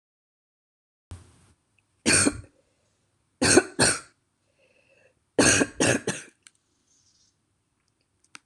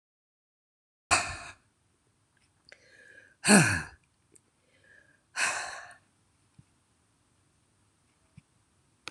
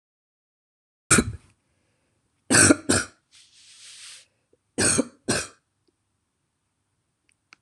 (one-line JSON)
{"three_cough_length": "8.5 s", "three_cough_amplitude": 21856, "three_cough_signal_mean_std_ratio": 0.3, "exhalation_length": "9.1 s", "exhalation_amplitude": 19567, "exhalation_signal_mean_std_ratio": 0.23, "cough_length": "7.6 s", "cough_amplitude": 26027, "cough_signal_mean_std_ratio": 0.27, "survey_phase": "alpha (2021-03-01 to 2021-08-12)", "age": "65+", "gender": "Female", "wearing_mask": "No", "symptom_none": true, "smoker_status": "Never smoked", "respiratory_condition_asthma": false, "respiratory_condition_other": false, "recruitment_source": "REACT", "submission_delay": "3 days", "covid_test_result": "Negative", "covid_test_method": "RT-qPCR"}